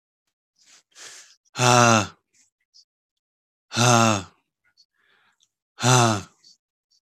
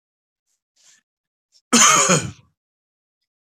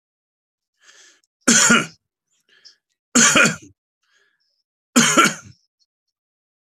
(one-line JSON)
{"exhalation_length": "7.2 s", "exhalation_amplitude": 25591, "exhalation_signal_mean_std_ratio": 0.34, "cough_length": "3.4 s", "cough_amplitude": 30918, "cough_signal_mean_std_ratio": 0.32, "three_cough_length": "6.7 s", "three_cough_amplitude": 32618, "three_cough_signal_mean_std_ratio": 0.33, "survey_phase": "beta (2021-08-13 to 2022-03-07)", "age": "45-64", "gender": "Male", "wearing_mask": "No", "symptom_none": true, "smoker_status": "Never smoked", "respiratory_condition_asthma": false, "respiratory_condition_other": false, "recruitment_source": "Test and Trace", "submission_delay": "2 days", "covid_test_result": "Negative", "covid_test_method": "RT-qPCR"}